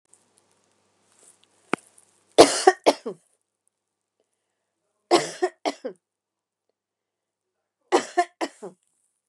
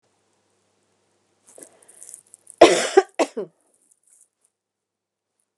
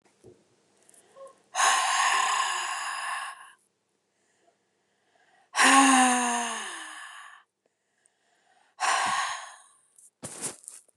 {"three_cough_length": "9.3 s", "three_cough_amplitude": 32768, "three_cough_signal_mean_std_ratio": 0.21, "cough_length": "5.6 s", "cough_amplitude": 32768, "cough_signal_mean_std_ratio": 0.19, "exhalation_length": "11.0 s", "exhalation_amplitude": 16791, "exhalation_signal_mean_std_ratio": 0.45, "survey_phase": "beta (2021-08-13 to 2022-03-07)", "age": "45-64", "gender": "Female", "wearing_mask": "No", "symptom_none": true, "smoker_status": "Ex-smoker", "respiratory_condition_asthma": false, "respiratory_condition_other": false, "recruitment_source": "REACT", "submission_delay": "1 day", "covid_test_result": "Negative", "covid_test_method": "RT-qPCR", "influenza_a_test_result": "Negative", "influenza_b_test_result": "Negative"}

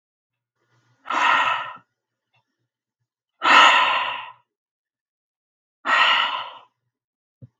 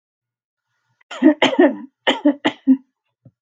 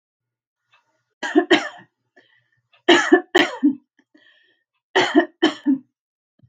{"exhalation_length": "7.6 s", "exhalation_amplitude": 31895, "exhalation_signal_mean_std_ratio": 0.38, "cough_length": "3.4 s", "cough_amplitude": 32281, "cough_signal_mean_std_ratio": 0.38, "three_cough_length": "6.5 s", "three_cough_amplitude": 32766, "three_cough_signal_mean_std_ratio": 0.35, "survey_phase": "beta (2021-08-13 to 2022-03-07)", "age": "45-64", "gender": "Female", "wearing_mask": "No", "symptom_none": true, "smoker_status": "Never smoked", "respiratory_condition_asthma": false, "respiratory_condition_other": false, "recruitment_source": "REACT", "submission_delay": "1 day", "covid_test_result": "Negative", "covid_test_method": "RT-qPCR", "influenza_a_test_result": "Unknown/Void", "influenza_b_test_result": "Unknown/Void"}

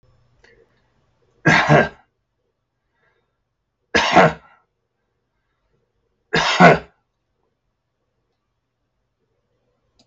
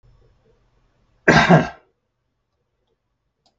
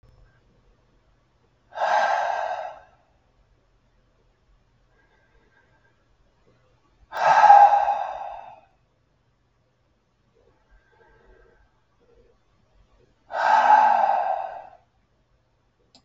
{"three_cough_length": "10.1 s", "three_cough_amplitude": 32768, "three_cough_signal_mean_std_ratio": 0.26, "cough_length": "3.6 s", "cough_amplitude": 32768, "cough_signal_mean_std_ratio": 0.25, "exhalation_length": "16.0 s", "exhalation_amplitude": 31962, "exhalation_signal_mean_std_ratio": 0.32, "survey_phase": "beta (2021-08-13 to 2022-03-07)", "age": "65+", "gender": "Male", "wearing_mask": "No", "symptom_none": true, "smoker_status": "Never smoked", "respiratory_condition_asthma": false, "respiratory_condition_other": false, "recruitment_source": "REACT", "submission_delay": "1 day", "covid_test_result": "Negative", "covid_test_method": "RT-qPCR"}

